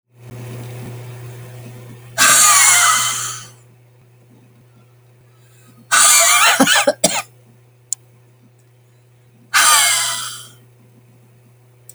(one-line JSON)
{"exhalation_length": "11.9 s", "exhalation_amplitude": 32768, "exhalation_signal_mean_std_ratio": 0.45, "survey_phase": "alpha (2021-03-01 to 2021-08-12)", "age": "45-64", "gender": "Female", "wearing_mask": "No", "symptom_shortness_of_breath": true, "symptom_fatigue": true, "symptom_headache": true, "smoker_status": "Never smoked", "respiratory_condition_asthma": false, "respiratory_condition_other": false, "recruitment_source": "REACT", "submission_delay": "1 day", "covid_test_result": "Negative", "covid_test_method": "RT-qPCR"}